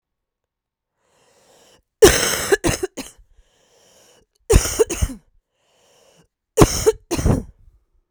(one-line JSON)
{"three_cough_length": "8.1 s", "three_cough_amplitude": 32768, "three_cough_signal_mean_std_ratio": 0.32, "survey_phase": "beta (2021-08-13 to 2022-03-07)", "age": "18-44", "gender": "Female", "wearing_mask": "No", "symptom_cough_any": true, "symptom_runny_or_blocked_nose": true, "symptom_sore_throat": true, "symptom_fatigue": true, "symptom_headache": true, "symptom_change_to_sense_of_smell_or_taste": true, "symptom_loss_of_taste": true, "symptom_onset": "4 days", "smoker_status": "Ex-smoker", "respiratory_condition_asthma": true, "respiratory_condition_other": false, "recruitment_source": "Test and Trace", "submission_delay": "1 day", "covid_test_result": "Positive", "covid_test_method": "RT-qPCR", "covid_ct_value": 14.9, "covid_ct_gene": "ORF1ab gene", "covid_ct_mean": 15.3, "covid_viral_load": "9300000 copies/ml", "covid_viral_load_category": "High viral load (>1M copies/ml)"}